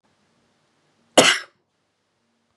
{"cough_length": "2.6 s", "cough_amplitude": 32767, "cough_signal_mean_std_ratio": 0.21, "survey_phase": "beta (2021-08-13 to 2022-03-07)", "age": "18-44", "gender": "Female", "wearing_mask": "No", "symptom_none": true, "smoker_status": "Never smoked", "respiratory_condition_asthma": true, "respiratory_condition_other": false, "recruitment_source": "REACT", "submission_delay": "2 days", "covid_test_result": "Negative", "covid_test_method": "RT-qPCR"}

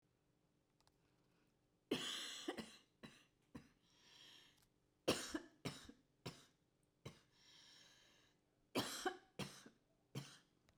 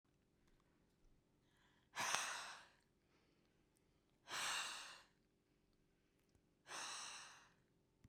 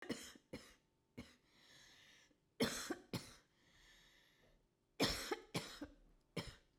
{"three_cough_length": "10.8 s", "three_cough_amplitude": 2054, "three_cough_signal_mean_std_ratio": 0.35, "exhalation_length": "8.1 s", "exhalation_amplitude": 3081, "exhalation_signal_mean_std_ratio": 0.4, "cough_length": "6.8 s", "cough_amplitude": 1840, "cough_signal_mean_std_ratio": 0.38, "survey_phase": "beta (2021-08-13 to 2022-03-07)", "age": "18-44", "gender": "Female", "wearing_mask": "No", "symptom_headache": true, "smoker_status": "Ex-smoker", "respiratory_condition_asthma": false, "respiratory_condition_other": true, "recruitment_source": "REACT", "submission_delay": "6 days", "covid_test_result": "Negative", "covid_test_method": "RT-qPCR"}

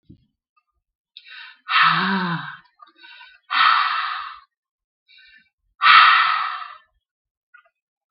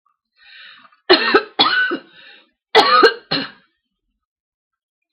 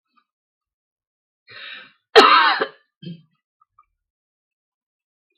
{"exhalation_length": "8.1 s", "exhalation_amplitude": 32766, "exhalation_signal_mean_std_ratio": 0.4, "three_cough_length": "5.1 s", "three_cough_amplitude": 32768, "three_cough_signal_mean_std_ratio": 0.38, "cough_length": "5.4 s", "cough_amplitude": 32768, "cough_signal_mean_std_ratio": 0.24, "survey_phase": "beta (2021-08-13 to 2022-03-07)", "age": "45-64", "gender": "Female", "wearing_mask": "No", "symptom_headache": true, "symptom_onset": "12 days", "smoker_status": "Never smoked", "respiratory_condition_asthma": false, "respiratory_condition_other": false, "recruitment_source": "REACT", "submission_delay": "11 days", "covid_test_result": "Negative", "covid_test_method": "RT-qPCR", "influenza_a_test_result": "Negative", "influenza_b_test_result": "Negative"}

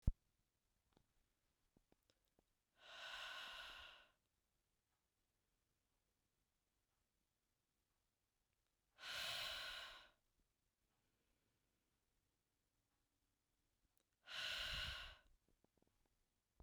{"exhalation_length": "16.6 s", "exhalation_amplitude": 2187, "exhalation_signal_mean_std_ratio": 0.29, "survey_phase": "beta (2021-08-13 to 2022-03-07)", "age": "18-44", "gender": "Female", "wearing_mask": "No", "symptom_fatigue": true, "smoker_status": "Never smoked", "respiratory_condition_asthma": false, "respiratory_condition_other": false, "recruitment_source": "REACT", "submission_delay": "1 day", "covid_test_result": "Negative", "covid_test_method": "RT-qPCR"}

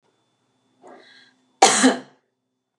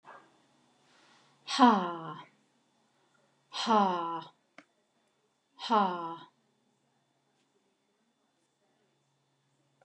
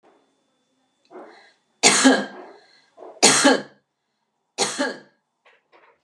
{"cough_length": "2.8 s", "cough_amplitude": 32764, "cough_signal_mean_std_ratio": 0.27, "exhalation_length": "9.8 s", "exhalation_amplitude": 11864, "exhalation_signal_mean_std_ratio": 0.28, "three_cough_length": "6.0 s", "three_cough_amplitude": 31641, "three_cough_signal_mean_std_ratio": 0.33, "survey_phase": "beta (2021-08-13 to 2022-03-07)", "age": "45-64", "gender": "Female", "wearing_mask": "No", "symptom_none": true, "symptom_onset": "5 days", "smoker_status": "Ex-smoker", "respiratory_condition_asthma": false, "respiratory_condition_other": true, "recruitment_source": "REACT", "submission_delay": "3 days", "covid_test_result": "Negative", "covid_test_method": "RT-qPCR", "influenza_a_test_result": "Negative", "influenza_b_test_result": "Negative"}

